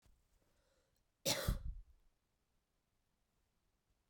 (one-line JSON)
{"cough_length": "4.1 s", "cough_amplitude": 2806, "cough_signal_mean_std_ratio": 0.27, "survey_phase": "beta (2021-08-13 to 2022-03-07)", "age": "18-44", "gender": "Female", "wearing_mask": "No", "symptom_runny_or_blocked_nose": true, "symptom_headache": true, "symptom_onset": "3 days", "smoker_status": "Ex-smoker", "respiratory_condition_asthma": false, "respiratory_condition_other": false, "recruitment_source": "Test and Trace", "submission_delay": "2 days", "covid_test_result": "Positive", "covid_test_method": "RT-qPCR"}